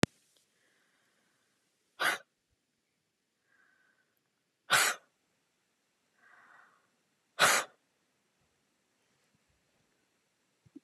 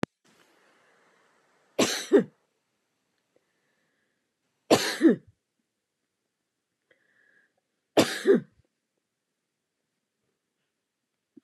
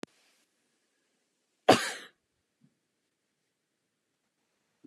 {"exhalation_length": "10.8 s", "exhalation_amplitude": 19793, "exhalation_signal_mean_std_ratio": 0.19, "three_cough_length": "11.4 s", "three_cough_amplitude": 19580, "three_cough_signal_mean_std_ratio": 0.22, "cough_length": "4.9 s", "cough_amplitude": 16310, "cough_signal_mean_std_ratio": 0.14, "survey_phase": "beta (2021-08-13 to 2022-03-07)", "age": "65+", "gender": "Female", "wearing_mask": "No", "symptom_runny_or_blocked_nose": true, "symptom_other": true, "smoker_status": "Ex-smoker", "respiratory_condition_asthma": false, "respiratory_condition_other": false, "recruitment_source": "REACT", "submission_delay": "2 days", "covid_test_result": "Negative", "covid_test_method": "RT-qPCR", "influenza_a_test_result": "Negative", "influenza_b_test_result": "Negative"}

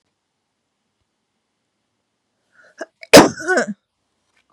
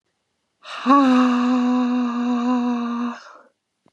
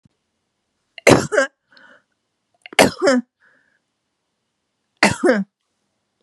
{"cough_length": "4.5 s", "cough_amplitude": 32768, "cough_signal_mean_std_ratio": 0.2, "exhalation_length": "3.9 s", "exhalation_amplitude": 26334, "exhalation_signal_mean_std_ratio": 0.76, "three_cough_length": "6.2 s", "three_cough_amplitude": 32768, "three_cough_signal_mean_std_ratio": 0.3, "survey_phase": "beta (2021-08-13 to 2022-03-07)", "age": "45-64", "gender": "Female", "wearing_mask": "No", "symptom_cough_any": true, "symptom_runny_or_blocked_nose": true, "symptom_sore_throat": true, "symptom_fatigue": true, "symptom_headache": true, "smoker_status": "Never smoked", "respiratory_condition_asthma": false, "respiratory_condition_other": false, "recruitment_source": "Test and Trace", "submission_delay": "2 days", "covid_test_result": "Positive", "covid_test_method": "LFT"}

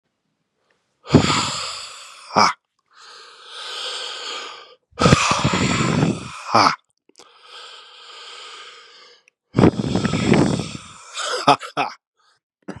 {"exhalation_length": "12.8 s", "exhalation_amplitude": 32768, "exhalation_signal_mean_std_ratio": 0.45, "survey_phase": "beta (2021-08-13 to 2022-03-07)", "age": "45-64", "gender": "Male", "wearing_mask": "No", "symptom_cough_any": true, "symptom_new_continuous_cough": true, "symptom_fatigue": true, "symptom_fever_high_temperature": true, "symptom_headache": true, "symptom_onset": "3 days", "smoker_status": "Never smoked", "respiratory_condition_asthma": false, "respiratory_condition_other": false, "recruitment_source": "Test and Trace", "submission_delay": "2 days", "covid_test_result": "Positive", "covid_test_method": "RT-qPCR", "covid_ct_value": 10.7, "covid_ct_gene": "ORF1ab gene"}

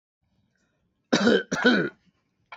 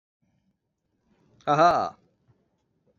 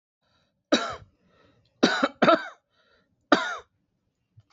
{"cough_length": "2.6 s", "cough_amplitude": 19710, "cough_signal_mean_std_ratio": 0.4, "exhalation_length": "3.0 s", "exhalation_amplitude": 13501, "exhalation_signal_mean_std_ratio": 0.3, "three_cough_length": "4.5 s", "three_cough_amplitude": 25884, "three_cough_signal_mean_std_ratio": 0.3, "survey_phase": "alpha (2021-03-01 to 2021-08-12)", "age": "45-64", "gender": "Male", "wearing_mask": "No", "symptom_none": true, "smoker_status": "Ex-smoker", "respiratory_condition_asthma": false, "respiratory_condition_other": false, "recruitment_source": "REACT", "submission_delay": "5 days", "covid_test_result": "Negative", "covid_test_method": "RT-qPCR"}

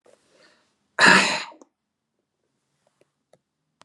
{"cough_length": "3.8 s", "cough_amplitude": 30117, "cough_signal_mean_std_ratio": 0.25, "survey_phase": "beta (2021-08-13 to 2022-03-07)", "age": "65+", "gender": "Male", "wearing_mask": "No", "symptom_none": true, "smoker_status": "Never smoked", "respiratory_condition_asthma": false, "respiratory_condition_other": false, "recruitment_source": "REACT", "submission_delay": "2 days", "covid_test_result": "Negative", "covid_test_method": "RT-qPCR", "influenza_a_test_result": "Negative", "influenza_b_test_result": "Negative"}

